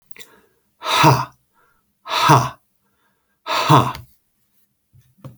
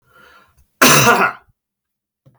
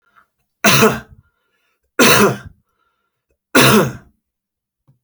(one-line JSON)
{"exhalation_length": "5.4 s", "exhalation_amplitude": 32323, "exhalation_signal_mean_std_ratio": 0.37, "cough_length": "2.4 s", "cough_amplitude": 32768, "cough_signal_mean_std_ratio": 0.38, "three_cough_length": "5.0 s", "three_cough_amplitude": 32768, "three_cough_signal_mean_std_ratio": 0.38, "survey_phase": "beta (2021-08-13 to 2022-03-07)", "age": "45-64", "gender": "Male", "wearing_mask": "No", "symptom_runny_or_blocked_nose": true, "symptom_onset": "5 days", "smoker_status": "Ex-smoker", "respiratory_condition_asthma": false, "respiratory_condition_other": false, "recruitment_source": "REACT", "submission_delay": "4 days", "covid_test_result": "Negative", "covid_test_method": "RT-qPCR", "covid_ct_value": 45.0, "covid_ct_gene": "N gene"}